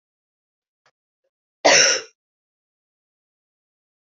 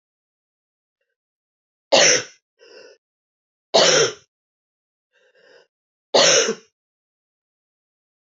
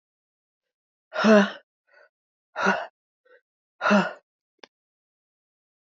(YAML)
cough_length: 4.0 s
cough_amplitude: 28702
cough_signal_mean_std_ratio: 0.23
three_cough_length: 8.3 s
three_cough_amplitude: 28051
three_cough_signal_mean_std_ratio: 0.29
exhalation_length: 6.0 s
exhalation_amplitude: 19342
exhalation_signal_mean_std_ratio: 0.28
survey_phase: beta (2021-08-13 to 2022-03-07)
age: 18-44
gender: Female
wearing_mask: 'No'
symptom_cough_any: true
symptom_new_continuous_cough: true
symptom_runny_or_blocked_nose: true
symptom_shortness_of_breath: true
symptom_sore_throat: true
symptom_abdominal_pain: true
symptom_fatigue: true
symptom_change_to_sense_of_smell_or_taste: true
symptom_loss_of_taste: true
symptom_onset: 5 days
smoker_status: Ex-smoker
respiratory_condition_asthma: false
respiratory_condition_other: false
recruitment_source: Test and Trace
submission_delay: 2 days
covid_test_result: Positive
covid_test_method: RT-qPCR
covid_ct_value: 17.8
covid_ct_gene: ORF1ab gene
covid_ct_mean: 18.1
covid_viral_load: 1200000 copies/ml
covid_viral_load_category: High viral load (>1M copies/ml)